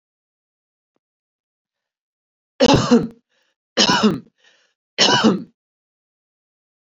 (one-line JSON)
{"three_cough_length": "7.0 s", "three_cough_amplitude": 32767, "three_cough_signal_mean_std_ratio": 0.33, "survey_phase": "beta (2021-08-13 to 2022-03-07)", "age": "18-44", "gender": "Female", "wearing_mask": "No", "symptom_cough_any": true, "symptom_sore_throat": true, "symptom_fatigue": true, "symptom_fever_high_temperature": true, "symptom_headache": true, "symptom_onset": "3 days", "smoker_status": "Never smoked", "respiratory_condition_asthma": false, "respiratory_condition_other": false, "recruitment_source": "Test and Trace", "submission_delay": "2 days", "covid_test_result": "Positive", "covid_test_method": "RT-qPCR", "covid_ct_value": 16.3, "covid_ct_gene": "ORF1ab gene", "covid_ct_mean": 16.4, "covid_viral_load": "4300000 copies/ml", "covid_viral_load_category": "High viral load (>1M copies/ml)"}